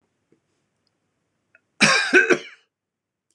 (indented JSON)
{
  "cough_length": "3.3 s",
  "cough_amplitude": 26026,
  "cough_signal_mean_std_ratio": 0.31,
  "survey_phase": "beta (2021-08-13 to 2022-03-07)",
  "age": "65+",
  "gender": "Male",
  "wearing_mask": "No",
  "symptom_none": true,
  "smoker_status": "Never smoked",
  "respiratory_condition_asthma": false,
  "respiratory_condition_other": false,
  "recruitment_source": "REACT",
  "submission_delay": "2 days",
  "covid_test_result": "Negative",
  "covid_test_method": "RT-qPCR",
  "influenza_a_test_result": "Negative",
  "influenza_b_test_result": "Negative"
}